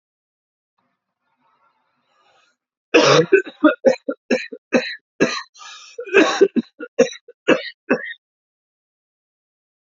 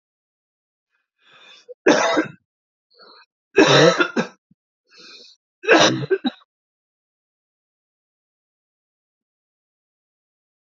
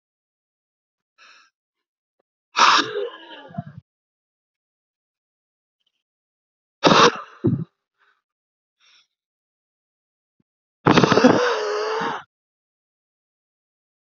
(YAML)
cough_length: 9.8 s
cough_amplitude: 29034
cough_signal_mean_std_ratio: 0.34
three_cough_length: 10.7 s
three_cough_amplitude: 28209
three_cough_signal_mean_std_ratio: 0.28
exhalation_length: 14.1 s
exhalation_amplitude: 31643
exhalation_signal_mean_std_ratio: 0.29
survey_phase: alpha (2021-03-01 to 2021-08-12)
age: 18-44
gender: Male
wearing_mask: 'No'
symptom_cough_any: true
symptom_fatigue: true
symptom_fever_high_temperature: true
symptom_headache: true
symptom_change_to_sense_of_smell_or_taste: true
smoker_status: Current smoker (e-cigarettes or vapes only)
respiratory_condition_asthma: false
respiratory_condition_other: false
recruitment_source: Test and Trace
submission_delay: 2 days
covid_test_result: Positive
covid_test_method: LFT